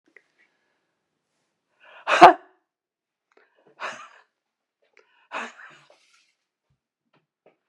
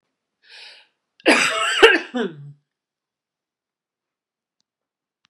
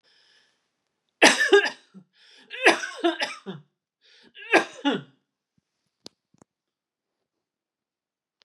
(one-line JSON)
{"exhalation_length": "7.7 s", "exhalation_amplitude": 32768, "exhalation_signal_mean_std_ratio": 0.14, "cough_length": "5.3 s", "cough_amplitude": 32768, "cough_signal_mean_std_ratio": 0.29, "three_cough_length": "8.4 s", "three_cough_amplitude": 30497, "three_cough_signal_mean_std_ratio": 0.27, "survey_phase": "beta (2021-08-13 to 2022-03-07)", "age": "65+", "gender": "Female", "wearing_mask": "No", "symptom_none": true, "smoker_status": "Ex-smoker", "respiratory_condition_asthma": false, "respiratory_condition_other": false, "recruitment_source": "REACT", "submission_delay": "2 days", "covid_test_result": "Negative", "covid_test_method": "RT-qPCR", "influenza_a_test_result": "Negative", "influenza_b_test_result": "Negative"}